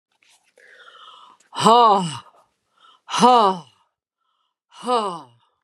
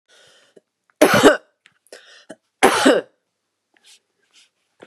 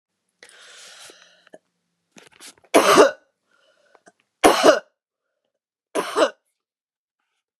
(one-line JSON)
{"exhalation_length": "5.6 s", "exhalation_amplitude": 30332, "exhalation_signal_mean_std_ratio": 0.36, "cough_length": "4.9 s", "cough_amplitude": 32768, "cough_signal_mean_std_ratio": 0.3, "three_cough_length": "7.6 s", "three_cough_amplitude": 32767, "three_cough_signal_mean_std_ratio": 0.27, "survey_phase": "beta (2021-08-13 to 2022-03-07)", "age": "45-64", "gender": "Female", "wearing_mask": "No", "symptom_runny_or_blocked_nose": true, "symptom_onset": "6 days", "smoker_status": "Never smoked", "respiratory_condition_asthma": true, "respiratory_condition_other": false, "recruitment_source": "Test and Trace", "submission_delay": "4 days", "covid_test_result": "Negative", "covid_test_method": "ePCR"}